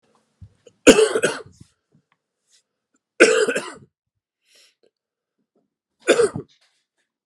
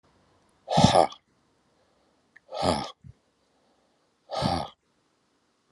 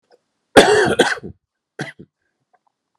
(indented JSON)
{
  "three_cough_length": "7.3 s",
  "three_cough_amplitude": 32768,
  "three_cough_signal_mean_std_ratio": 0.27,
  "exhalation_length": "5.7 s",
  "exhalation_amplitude": 23519,
  "exhalation_signal_mean_std_ratio": 0.29,
  "cough_length": "3.0 s",
  "cough_amplitude": 32768,
  "cough_signal_mean_std_ratio": 0.34,
  "survey_phase": "alpha (2021-03-01 to 2021-08-12)",
  "age": "45-64",
  "gender": "Male",
  "wearing_mask": "No",
  "symptom_cough_any": true,
  "symptom_shortness_of_breath": true,
  "symptom_fatigue": true,
  "symptom_headache": true,
  "smoker_status": "Current smoker (1 to 10 cigarettes per day)",
  "respiratory_condition_asthma": false,
  "respiratory_condition_other": false,
  "recruitment_source": "Test and Trace",
  "submission_delay": "1 day",
  "covid_test_result": "Positive",
  "covid_test_method": "RT-qPCR",
  "covid_ct_value": 17.1,
  "covid_ct_gene": "ORF1ab gene",
  "covid_ct_mean": 18.2,
  "covid_viral_load": "1100000 copies/ml",
  "covid_viral_load_category": "High viral load (>1M copies/ml)"
}